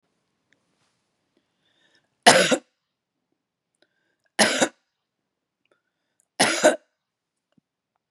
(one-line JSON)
{"three_cough_length": "8.1 s", "three_cough_amplitude": 32763, "three_cough_signal_mean_std_ratio": 0.24, "survey_phase": "beta (2021-08-13 to 2022-03-07)", "age": "45-64", "gender": "Female", "wearing_mask": "No", "symptom_none": true, "smoker_status": "Ex-smoker", "respiratory_condition_asthma": false, "respiratory_condition_other": false, "recruitment_source": "REACT", "submission_delay": "2 days", "covid_test_result": "Negative", "covid_test_method": "RT-qPCR", "influenza_a_test_result": "Negative", "influenza_b_test_result": "Negative"}